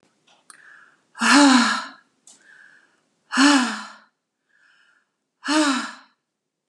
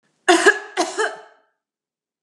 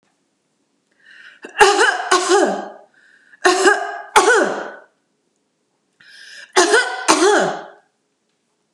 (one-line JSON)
{"exhalation_length": "6.7 s", "exhalation_amplitude": 27059, "exhalation_signal_mean_std_ratio": 0.38, "cough_length": "2.2 s", "cough_amplitude": 30595, "cough_signal_mean_std_ratio": 0.37, "three_cough_length": "8.7 s", "three_cough_amplitude": 32768, "three_cough_signal_mean_std_ratio": 0.47, "survey_phase": "beta (2021-08-13 to 2022-03-07)", "age": "45-64", "gender": "Female", "wearing_mask": "No", "symptom_none": true, "smoker_status": "Never smoked", "respiratory_condition_asthma": false, "respiratory_condition_other": false, "recruitment_source": "REACT", "submission_delay": "2 days", "covid_test_result": "Negative", "covid_test_method": "RT-qPCR", "influenza_a_test_result": "Negative", "influenza_b_test_result": "Negative"}